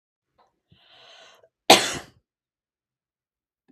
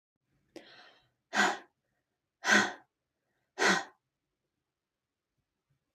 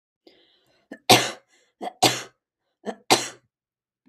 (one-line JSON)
{"cough_length": "3.7 s", "cough_amplitude": 32767, "cough_signal_mean_std_ratio": 0.17, "exhalation_length": "5.9 s", "exhalation_amplitude": 8923, "exhalation_signal_mean_std_ratio": 0.27, "three_cough_length": "4.1 s", "three_cough_amplitude": 32767, "three_cough_signal_mean_std_ratio": 0.26, "survey_phase": "beta (2021-08-13 to 2022-03-07)", "age": "18-44", "gender": "Female", "wearing_mask": "No", "symptom_none": true, "smoker_status": "Never smoked", "respiratory_condition_asthma": false, "respiratory_condition_other": false, "recruitment_source": "REACT", "submission_delay": "1 day", "covid_test_result": "Negative", "covid_test_method": "RT-qPCR", "influenza_a_test_result": "Negative", "influenza_b_test_result": "Negative"}